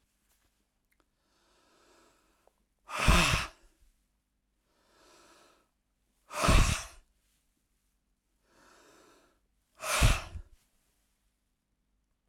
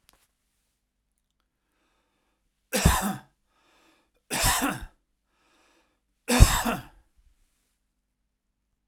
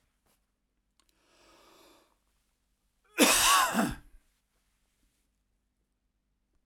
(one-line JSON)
{"exhalation_length": "12.3 s", "exhalation_amplitude": 11845, "exhalation_signal_mean_std_ratio": 0.26, "three_cough_length": "8.9 s", "three_cough_amplitude": 32767, "three_cough_signal_mean_std_ratio": 0.26, "cough_length": "6.7 s", "cough_amplitude": 14654, "cough_signal_mean_std_ratio": 0.27, "survey_phase": "alpha (2021-03-01 to 2021-08-12)", "age": "65+", "gender": "Male", "wearing_mask": "No", "symptom_none": true, "smoker_status": "Ex-smoker", "respiratory_condition_asthma": false, "respiratory_condition_other": false, "recruitment_source": "REACT", "submission_delay": "1 day", "covid_test_result": "Negative", "covid_test_method": "RT-qPCR"}